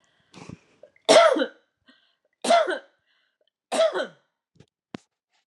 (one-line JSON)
{"three_cough_length": "5.5 s", "three_cough_amplitude": 24523, "three_cough_signal_mean_std_ratio": 0.33, "survey_phase": "alpha (2021-03-01 to 2021-08-12)", "age": "45-64", "gender": "Female", "wearing_mask": "No", "symptom_none": true, "smoker_status": "Never smoked", "respiratory_condition_asthma": false, "respiratory_condition_other": false, "recruitment_source": "REACT", "submission_delay": "2 days", "covid_test_result": "Negative", "covid_test_method": "RT-qPCR"}